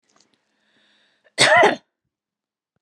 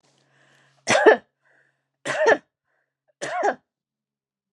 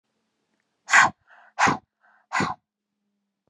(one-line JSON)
{"cough_length": "2.8 s", "cough_amplitude": 29509, "cough_signal_mean_std_ratio": 0.29, "three_cough_length": "4.5 s", "three_cough_amplitude": 27582, "three_cough_signal_mean_std_ratio": 0.31, "exhalation_length": "3.5 s", "exhalation_amplitude": 24702, "exhalation_signal_mean_std_ratio": 0.29, "survey_phase": "beta (2021-08-13 to 2022-03-07)", "age": "45-64", "gender": "Female", "wearing_mask": "No", "symptom_none": true, "smoker_status": "Ex-smoker", "respiratory_condition_asthma": false, "respiratory_condition_other": false, "recruitment_source": "REACT", "submission_delay": "2 days", "covid_test_result": "Negative", "covid_test_method": "RT-qPCR", "influenza_a_test_result": "Negative", "influenza_b_test_result": "Negative"}